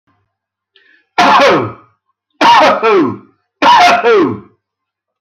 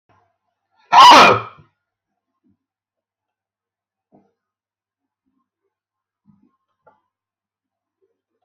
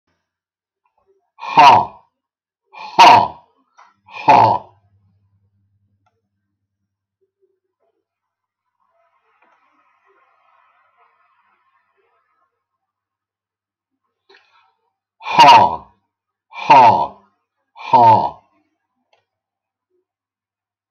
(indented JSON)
{
  "three_cough_length": "5.2 s",
  "three_cough_amplitude": 32768,
  "three_cough_signal_mean_std_ratio": 0.6,
  "cough_length": "8.4 s",
  "cough_amplitude": 32768,
  "cough_signal_mean_std_ratio": 0.21,
  "exhalation_length": "20.9 s",
  "exhalation_amplitude": 32768,
  "exhalation_signal_mean_std_ratio": 0.27,
  "survey_phase": "alpha (2021-03-01 to 2021-08-12)",
  "age": "65+",
  "gender": "Male",
  "wearing_mask": "No",
  "symptom_shortness_of_breath": true,
  "symptom_abdominal_pain": true,
  "symptom_diarrhoea": true,
  "symptom_fatigue": true,
  "symptom_onset": "12 days",
  "smoker_status": "Ex-smoker",
  "respiratory_condition_asthma": false,
  "respiratory_condition_other": true,
  "recruitment_source": "REACT",
  "submission_delay": "3 days",
  "covid_test_result": "Negative",
  "covid_test_method": "RT-qPCR"
}